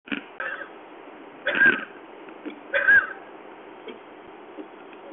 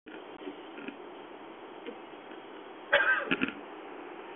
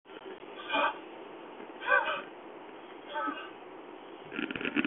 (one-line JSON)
{"three_cough_length": "5.1 s", "three_cough_amplitude": 13695, "three_cough_signal_mean_std_ratio": 0.42, "cough_length": "4.4 s", "cough_amplitude": 9066, "cough_signal_mean_std_ratio": 0.51, "exhalation_length": "4.9 s", "exhalation_amplitude": 8344, "exhalation_signal_mean_std_ratio": 0.58, "survey_phase": "beta (2021-08-13 to 2022-03-07)", "age": "45-64", "gender": "Male", "wearing_mask": "No", "symptom_none": true, "smoker_status": "Ex-smoker", "respiratory_condition_asthma": false, "respiratory_condition_other": false, "recruitment_source": "REACT", "submission_delay": "1 day", "covid_test_result": "Negative", "covid_test_method": "RT-qPCR", "influenza_a_test_result": "Negative", "influenza_b_test_result": "Negative"}